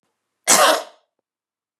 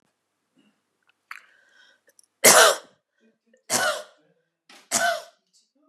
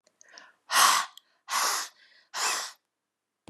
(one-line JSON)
{"cough_length": "1.8 s", "cough_amplitude": 32767, "cough_signal_mean_std_ratio": 0.34, "three_cough_length": "5.9 s", "three_cough_amplitude": 32425, "three_cough_signal_mean_std_ratio": 0.27, "exhalation_length": "3.5 s", "exhalation_amplitude": 14120, "exhalation_signal_mean_std_ratio": 0.42, "survey_phase": "beta (2021-08-13 to 2022-03-07)", "age": "45-64", "gender": "Female", "wearing_mask": "No", "symptom_none": true, "symptom_onset": "6 days", "smoker_status": "Ex-smoker", "respiratory_condition_asthma": false, "respiratory_condition_other": false, "recruitment_source": "REACT", "submission_delay": "2 days", "covid_test_result": "Negative", "covid_test_method": "RT-qPCR", "influenza_a_test_result": "Negative", "influenza_b_test_result": "Negative"}